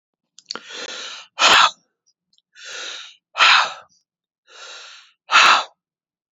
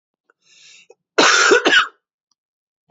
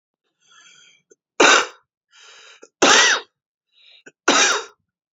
{"exhalation_length": "6.3 s", "exhalation_amplitude": 30560, "exhalation_signal_mean_std_ratio": 0.35, "cough_length": "2.9 s", "cough_amplitude": 29180, "cough_signal_mean_std_ratio": 0.4, "three_cough_length": "5.1 s", "three_cough_amplitude": 29984, "three_cough_signal_mean_std_ratio": 0.36, "survey_phase": "beta (2021-08-13 to 2022-03-07)", "age": "45-64", "gender": "Male", "wearing_mask": "No", "symptom_cough_any": true, "symptom_new_continuous_cough": true, "symptom_sore_throat": true, "symptom_diarrhoea": true, "symptom_fever_high_temperature": true, "symptom_headache": true, "symptom_change_to_sense_of_smell_or_taste": true, "symptom_loss_of_taste": true, "symptom_onset": "4 days", "smoker_status": "Current smoker (11 or more cigarettes per day)", "respiratory_condition_asthma": false, "respiratory_condition_other": false, "recruitment_source": "Test and Trace", "submission_delay": "2 days", "covid_test_result": "Positive", "covid_test_method": "RT-qPCR", "covid_ct_value": 17.0, "covid_ct_gene": "ORF1ab gene", "covid_ct_mean": 17.5, "covid_viral_load": "1900000 copies/ml", "covid_viral_load_category": "High viral load (>1M copies/ml)"}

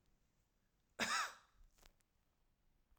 {"cough_length": "3.0 s", "cough_amplitude": 1736, "cough_signal_mean_std_ratio": 0.29, "survey_phase": "alpha (2021-03-01 to 2021-08-12)", "age": "45-64", "gender": "Female", "wearing_mask": "No", "symptom_none": true, "smoker_status": "Ex-smoker", "respiratory_condition_asthma": false, "respiratory_condition_other": false, "recruitment_source": "REACT", "submission_delay": "1 day", "covid_test_result": "Negative", "covid_test_method": "RT-qPCR"}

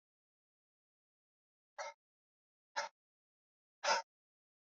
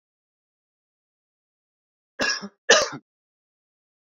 {"exhalation_length": "4.8 s", "exhalation_amplitude": 2775, "exhalation_signal_mean_std_ratio": 0.2, "cough_length": "4.1 s", "cough_amplitude": 26339, "cough_signal_mean_std_ratio": 0.22, "survey_phase": "beta (2021-08-13 to 2022-03-07)", "age": "18-44", "gender": "Male", "wearing_mask": "No", "symptom_cough_any": true, "symptom_new_continuous_cough": true, "symptom_runny_or_blocked_nose": true, "symptom_shortness_of_breath": true, "symptom_sore_throat": true, "symptom_fatigue": true, "symptom_change_to_sense_of_smell_or_taste": true, "symptom_loss_of_taste": true, "symptom_other": true, "symptom_onset": "3 days", "smoker_status": "Never smoked", "respiratory_condition_asthma": false, "respiratory_condition_other": false, "recruitment_source": "Test and Trace", "submission_delay": "2 days", "covid_test_result": "Positive", "covid_test_method": "RT-qPCR", "covid_ct_value": 15.8, "covid_ct_gene": "ORF1ab gene", "covid_ct_mean": 16.3, "covid_viral_load": "4500000 copies/ml", "covid_viral_load_category": "High viral load (>1M copies/ml)"}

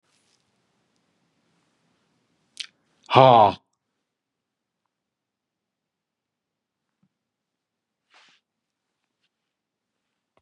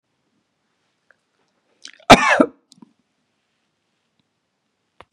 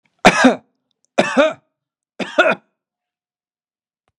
{"exhalation_length": "10.4 s", "exhalation_amplitude": 32108, "exhalation_signal_mean_std_ratio": 0.14, "cough_length": "5.1 s", "cough_amplitude": 32768, "cough_signal_mean_std_ratio": 0.18, "three_cough_length": "4.2 s", "three_cough_amplitude": 32768, "three_cough_signal_mean_std_ratio": 0.32, "survey_phase": "beta (2021-08-13 to 2022-03-07)", "age": "65+", "gender": "Male", "wearing_mask": "No", "symptom_none": true, "smoker_status": "Never smoked", "respiratory_condition_asthma": false, "respiratory_condition_other": false, "recruitment_source": "REACT", "submission_delay": "2 days", "covid_test_result": "Negative", "covid_test_method": "RT-qPCR", "influenza_a_test_result": "Negative", "influenza_b_test_result": "Negative"}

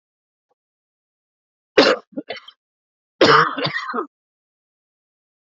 {"cough_length": "5.5 s", "cough_amplitude": 28402, "cough_signal_mean_std_ratio": 0.29, "survey_phase": "beta (2021-08-13 to 2022-03-07)", "age": "18-44", "gender": "Male", "wearing_mask": "No", "symptom_none": true, "smoker_status": "Never smoked", "respiratory_condition_asthma": false, "respiratory_condition_other": false, "recruitment_source": "REACT", "submission_delay": "3 days", "covid_test_result": "Negative", "covid_test_method": "RT-qPCR"}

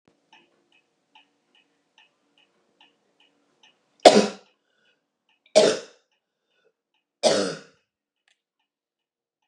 {"three_cough_length": "9.5 s", "three_cough_amplitude": 32768, "three_cough_signal_mean_std_ratio": 0.19, "survey_phase": "beta (2021-08-13 to 2022-03-07)", "age": "65+", "gender": "Female", "wearing_mask": "No", "symptom_runny_or_blocked_nose": true, "symptom_headache": true, "smoker_status": "Never smoked", "respiratory_condition_asthma": false, "respiratory_condition_other": false, "recruitment_source": "REACT", "submission_delay": "2 days", "covid_test_result": "Negative", "covid_test_method": "RT-qPCR", "influenza_a_test_result": "Negative", "influenza_b_test_result": "Negative"}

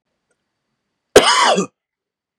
{"cough_length": "2.4 s", "cough_amplitude": 32768, "cough_signal_mean_std_ratio": 0.34, "survey_phase": "beta (2021-08-13 to 2022-03-07)", "age": "18-44", "gender": "Male", "wearing_mask": "No", "symptom_sore_throat": true, "symptom_onset": "7 days", "smoker_status": "Never smoked", "respiratory_condition_asthma": false, "respiratory_condition_other": false, "recruitment_source": "REACT", "submission_delay": "3 days", "covid_test_result": "Negative", "covid_test_method": "RT-qPCR", "influenza_a_test_result": "Negative", "influenza_b_test_result": "Negative"}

